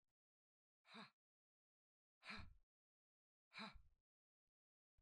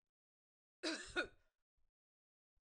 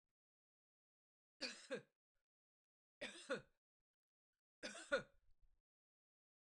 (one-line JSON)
{"exhalation_length": "5.0 s", "exhalation_amplitude": 259, "exhalation_signal_mean_std_ratio": 0.31, "cough_length": "2.6 s", "cough_amplitude": 1494, "cough_signal_mean_std_ratio": 0.28, "three_cough_length": "6.4 s", "three_cough_amplitude": 1362, "three_cough_signal_mean_std_ratio": 0.25, "survey_phase": "beta (2021-08-13 to 2022-03-07)", "age": "45-64", "gender": "Female", "wearing_mask": "No", "symptom_none": true, "smoker_status": "Ex-smoker", "respiratory_condition_asthma": false, "respiratory_condition_other": false, "recruitment_source": "REACT", "submission_delay": "1 day", "covid_test_result": "Negative", "covid_test_method": "RT-qPCR", "influenza_a_test_result": "Negative", "influenza_b_test_result": "Negative"}